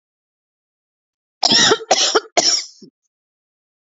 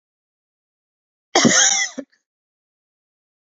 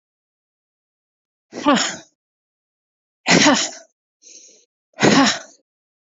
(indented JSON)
{
  "three_cough_length": "3.8 s",
  "three_cough_amplitude": 32767,
  "three_cough_signal_mean_std_ratio": 0.39,
  "cough_length": "3.4 s",
  "cough_amplitude": 29148,
  "cough_signal_mean_std_ratio": 0.31,
  "exhalation_length": "6.1 s",
  "exhalation_amplitude": 30257,
  "exhalation_signal_mean_std_ratio": 0.33,
  "survey_phase": "beta (2021-08-13 to 2022-03-07)",
  "age": "18-44",
  "gender": "Female",
  "wearing_mask": "No",
  "symptom_cough_any": true,
  "symptom_runny_or_blocked_nose": true,
  "symptom_onset": "3 days",
  "smoker_status": "Never smoked",
  "respiratory_condition_asthma": false,
  "respiratory_condition_other": false,
  "recruitment_source": "Test and Trace",
  "submission_delay": "1 day",
  "covid_test_result": "Positive",
  "covid_test_method": "ePCR"
}